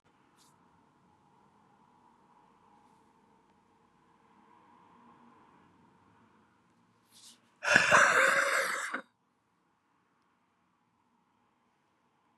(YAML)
exhalation_length: 12.4 s
exhalation_amplitude: 16305
exhalation_signal_mean_std_ratio: 0.26
survey_phase: beta (2021-08-13 to 2022-03-07)
age: 45-64
gender: Female
wearing_mask: 'No'
symptom_cough_any: true
symptom_runny_or_blocked_nose: true
symptom_sore_throat: true
symptom_onset: 4 days
smoker_status: Prefer not to say
respiratory_condition_asthma: false
respiratory_condition_other: false
recruitment_source: Test and Trace
submission_delay: 2 days
covid_test_result: Negative
covid_test_method: RT-qPCR